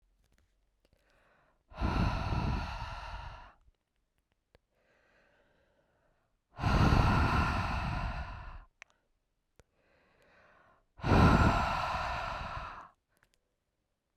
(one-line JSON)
{"exhalation_length": "14.2 s", "exhalation_amplitude": 8410, "exhalation_signal_mean_std_ratio": 0.44, "survey_phase": "beta (2021-08-13 to 2022-03-07)", "age": "18-44", "gender": "Female", "wearing_mask": "No", "symptom_cough_any": true, "symptom_runny_or_blocked_nose": true, "symptom_sore_throat": true, "symptom_fever_high_temperature": true, "symptom_headache": true, "symptom_change_to_sense_of_smell_or_taste": true, "symptom_loss_of_taste": true, "smoker_status": "Ex-smoker", "respiratory_condition_asthma": false, "respiratory_condition_other": false, "recruitment_source": "Test and Trace", "submission_delay": "3 days", "covid_test_result": "Positive", "covid_test_method": "RT-qPCR", "covid_ct_value": 22.3, "covid_ct_gene": "ORF1ab gene"}